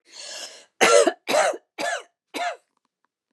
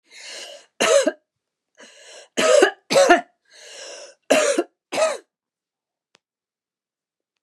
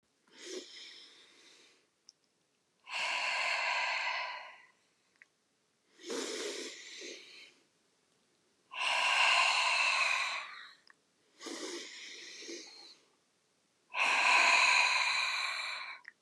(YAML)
cough_length: 3.3 s
cough_amplitude: 23317
cough_signal_mean_std_ratio: 0.42
three_cough_length: 7.4 s
three_cough_amplitude: 32767
three_cough_signal_mean_std_ratio: 0.37
exhalation_length: 16.2 s
exhalation_amplitude: 6295
exhalation_signal_mean_std_ratio: 0.53
survey_phase: beta (2021-08-13 to 2022-03-07)
age: 65+
gender: Female
wearing_mask: 'No'
symptom_none: true
smoker_status: Ex-smoker
respiratory_condition_asthma: false
respiratory_condition_other: false
recruitment_source: REACT
submission_delay: 0 days
covid_test_result: Negative
covid_test_method: RT-qPCR
influenza_a_test_result: Negative
influenza_b_test_result: Negative